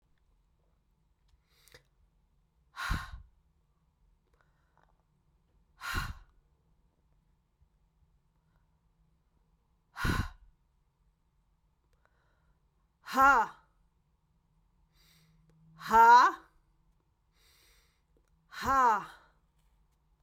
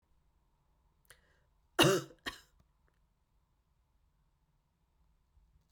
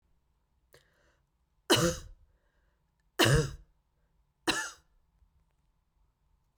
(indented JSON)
{
  "exhalation_length": "20.2 s",
  "exhalation_amplitude": 9750,
  "exhalation_signal_mean_std_ratio": 0.23,
  "cough_length": "5.7 s",
  "cough_amplitude": 8568,
  "cough_signal_mean_std_ratio": 0.18,
  "three_cough_length": "6.6 s",
  "three_cough_amplitude": 9190,
  "three_cough_signal_mean_std_ratio": 0.27,
  "survey_phase": "beta (2021-08-13 to 2022-03-07)",
  "age": "18-44",
  "gender": "Female",
  "wearing_mask": "No",
  "symptom_runny_or_blocked_nose": true,
  "symptom_headache": true,
  "smoker_status": "Never smoked",
  "respiratory_condition_asthma": false,
  "respiratory_condition_other": false,
  "recruitment_source": "Test and Trace",
  "submission_delay": "2 days",
  "covid_test_result": "Positive",
  "covid_test_method": "RT-qPCR",
  "covid_ct_value": 16.3,
  "covid_ct_gene": "ORF1ab gene",
  "covid_ct_mean": 16.4,
  "covid_viral_load": "4200000 copies/ml",
  "covid_viral_load_category": "High viral load (>1M copies/ml)"
}